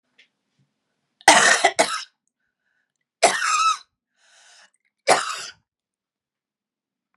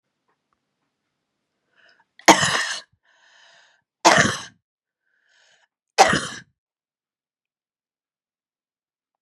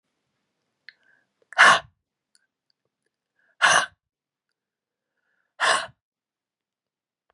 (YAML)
three_cough_length: 7.2 s
three_cough_amplitude: 32768
three_cough_signal_mean_std_ratio: 0.32
cough_length: 9.2 s
cough_amplitude: 32768
cough_signal_mean_std_ratio: 0.23
exhalation_length: 7.3 s
exhalation_amplitude: 26285
exhalation_signal_mean_std_ratio: 0.22
survey_phase: beta (2021-08-13 to 2022-03-07)
age: 45-64
gender: Female
wearing_mask: 'No'
symptom_cough_any: true
symptom_runny_or_blocked_nose: true
symptom_fatigue: true
symptom_onset: 4 days
smoker_status: Never smoked
respiratory_condition_asthma: false
respiratory_condition_other: false
recruitment_source: Test and Trace
submission_delay: 1 day
covid_test_result: Positive
covid_test_method: RT-qPCR
covid_ct_value: 15.7
covid_ct_gene: N gene